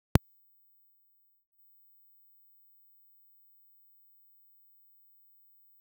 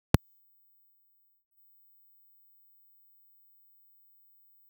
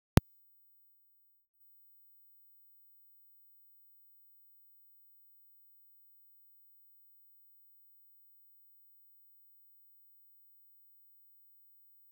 cough_length: 5.8 s
cough_amplitude: 19302
cough_signal_mean_std_ratio: 0.1
three_cough_length: 4.7 s
three_cough_amplitude: 19300
three_cough_signal_mean_std_ratio: 0.1
exhalation_length: 12.1 s
exhalation_amplitude: 19302
exhalation_signal_mean_std_ratio: 0.13
survey_phase: beta (2021-08-13 to 2022-03-07)
age: 65+
gender: Male
wearing_mask: 'No'
symptom_none: true
smoker_status: Never smoked
respiratory_condition_asthma: false
respiratory_condition_other: false
recruitment_source: REACT
submission_delay: 2 days
covid_test_result: Negative
covid_test_method: RT-qPCR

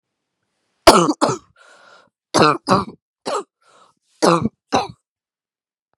three_cough_length: 6.0 s
three_cough_amplitude: 32768
three_cough_signal_mean_std_ratio: 0.33
survey_phase: beta (2021-08-13 to 2022-03-07)
age: 18-44
gender: Female
wearing_mask: 'No'
symptom_cough_any: true
symptom_new_continuous_cough: true
symptom_sore_throat: true
symptom_fatigue: true
symptom_onset: 3 days
smoker_status: Never smoked
respiratory_condition_asthma: false
respiratory_condition_other: false
recruitment_source: Test and Trace
submission_delay: 2 days
covid_test_result: Positive
covid_test_method: RT-qPCR
covid_ct_value: 19.8
covid_ct_gene: ORF1ab gene
covid_ct_mean: 20.9
covid_viral_load: 140000 copies/ml
covid_viral_load_category: Low viral load (10K-1M copies/ml)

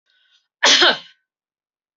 cough_length: 2.0 s
cough_amplitude: 28272
cough_signal_mean_std_ratio: 0.33
survey_phase: alpha (2021-03-01 to 2021-08-12)
age: 45-64
gender: Female
wearing_mask: 'No'
symptom_none: true
smoker_status: Current smoker (1 to 10 cigarettes per day)
respiratory_condition_asthma: true
respiratory_condition_other: false
recruitment_source: REACT
submission_delay: 1 day
covid_test_result: Negative
covid_test_method: RT-qPCR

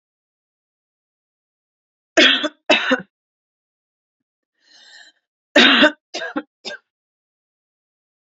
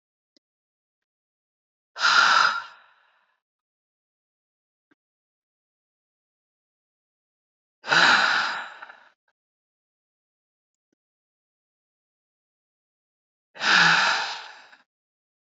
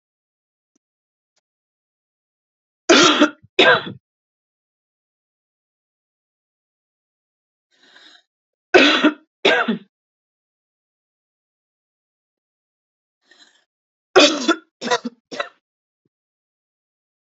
cough_length: 8.3 s
cough_amplitude: 29598
cough_signal_mean_std_ratio: 0.27
exhalation_length: 15.5 s
exhalation_amplitude: 19377
exhalation_signal_mean_std_ratio: 0.29
three_cough_length: 17.3 s
three_cough_amplitude: 32633
three_cough_signal_mean_std_ratio: 0.24
survey_phase: alpha (2021-03-01 to 2021-08-12)
age: 18-44
gender: Female
wearing_mask: 'No'
symptom_cough_any: true
symptom_shortness_of_breath: true
symptom_diarrhoea: true
symptom_fatigue: true
symptom_headache: true
symptom_change_to_sense_of_smell_or_taste: true
symptom_onset: 2 days
smoker_status: Never smoked
respiratory_condition_asthma: false
respiratory_condition_other: false
recruitment_source: Test and Trace
submission_delay: 1 day
covid_test_result: Positive
covid_test_method: RT-qPCR
covid_ct_value: 28.5
covid_ct_gene: ORF1ab gene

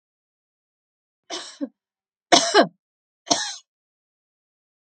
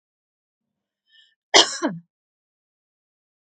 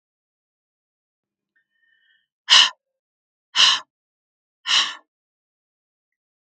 three_cough_length: 4.9 s
three_cough_amplitude: 32767
three_cough_signal_mean_std_ratio: 0.24
cough_length: 3.4 s
cough_amplitude: 32767
cough_signal_mean_std_ratio: 0.19
exhalation_length: 6.5 s
exhalation_amplitude: 32766
exhalation_signal_mean_std_ratio: 0.23
survey_phase: beta (2021-08-13 to 2022-03-07)
age: 65+
gender: Female
wearing_mask: 'No'
symptom_none: true
smoker_status: Never smoked
respiratory_condition_asthma: false
respiratory_condition_other: false
recruitment_source: REACT
submission_delay: 2 days
covid_test_result: Negative
covid_test_method: RT-qPCR
influenza_a_test_result: Negative
influenza_b_test_result: Negative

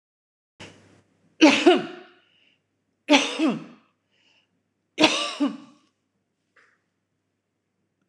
three_cough_length: 8.1 s
three_cough_amplitude: 25995
three_cough_signal_mean_std_ratio: 0.29
survey_phase: alpha (2021-03-01 to 2021-08-12)
age: 45-64
gender: Female
wearing_mask: 'Yes'
symptom_none: true
smoker_status: Current smoker (1 to 10 cigarettes per day)
respiratory_condition_asthma: false
respiratory_condition_other: false
recruitment_source: REACT
submission_delay: 3 days
covid_test_result: Negative
covid_test_method: RT-qPCR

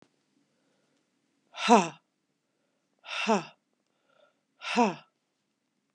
exhalation_length: 5.9 s
exhalation_amplitude: 16365
exhalation_signal_mean_std_ratio: 0.25
survey_phase: beta (2021-08-13 to 2022-03-07)
age: 45-64
gender: Female
wearing_mask: 'No'
symptom_cough_any: true
symptom_new_continuous_cough: true
symptom_runny_or_blocked_nose: true
symptom_shortness_of_breath: true
symptom_sore_throat: true
symptom_fatigue: true
symptom_onset: 3 days
smoker_status: Ex-smoker
respiratory_condition_asthma: false
respiratory_condition_other: false
recruitment_source: Test and Trace
submission_delay: 1 day
covid_test_result: Positive
covid_test_method: RT-qPCR
covid_ct_value: 12.6
covid_ct_gene: N gene
covid_ct_mean: 12.7
covid_viral_load: 68000000 copies/ml
covid_viral_load_category: High viral load (>1M copies/ml)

